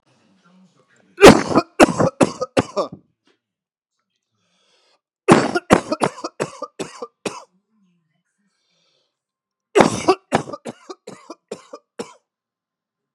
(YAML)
three_cough_length: 13.1 s
three_cough_amplitude: 32768
three_cough_signal_mean_std_ratio: 0.26
survey_phase: beta (2021-08-13 to 2022-03-07)
age: 45-64
gender: Female
wearing_mask: 'No'
symptom_cough_any: true
symptom_new_continuous_cough: true
symptom_runny_or_blocked_nose: true
symptom_shortness_of_breath: true
symptom_sore_throat: true
symptom_abdominal_pain: true
symptom_diarrhoea: true
symptom_fatigue: true
symptom_fever_high_temperature: true
symptom_headache: true
smoker_status: Never smoked
respiratory_condition_asthma: false
respiratory_condition_other: false
recruitment_source: Test and Trace
submission_delay: 2 days
covid_test_result: Negative
covid_test_method: LFT